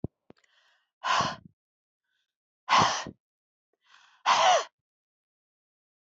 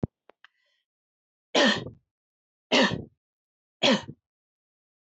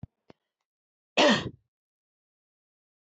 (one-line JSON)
{"exhalation_length": "6.1 s", "exhalation_amplitude": 12750, "exhalation_signal_mean_std_ratio": 0.32, "three_cough_length": "5.1 s", "three_cough_amplitude": 13909, "three_cough_signal_mean_std_ratio": 0.3, "cough_length": "3.1 s", "cough_amplitude": 13217, "cough_signal_mean_std_ratio": 0.23, "survey_phase": "beta (2021-08-13 to 2022-03-07)", "age": "45-64", "gender": "Female", "wearing_mask": "No", "symptom_fatigue": true, "symptom_headache": true, "smoker_status": "Never smoked", "respiratory_condition_asthma": false, "respiratory_condition_other": false, "recruitment_source": "Test and Trace", "submission_delay": "2 days", "covid_test_result": "Positive", "covid_test_method": "RT-qPCR"}